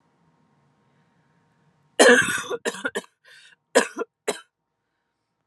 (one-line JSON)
{"cough_length": "5.5 s", "cough_amplitude": 28997, "cough_signal_mean_std_ratio": 0.28, "survey_phase": "alpha (2021-03-01 to 2021-08-12)", "age": "18-44", "gender": "Female", "wearing_mask": "No", "symptom_cough_any": true, "symptom_shortness_of_breath": true, "symptom_fatigue": true, "symptom_change_to_sense_of_smell_or_taste": true, "symptom_loss_of_taste": true, "symptom_onset": "3 days", "smoker_status": "Never smoked", "respiratory_condition_asthma": false, "respiratory_condition_other": false, "recruitment_source": "Test and Trace", "submission_delay": "1 day", "covid_test_result": "Positive", "covid_test_method": "RT-qPCR", "covid_ct_value": 16.0, "covid_ct_gene": "ORF1ab gene", "covid_ct_mean": 16.2, "covid_viral_load": "4700000 copies/ml", "covid_viral_load_category": "High viral load (>1M copies/ml)"}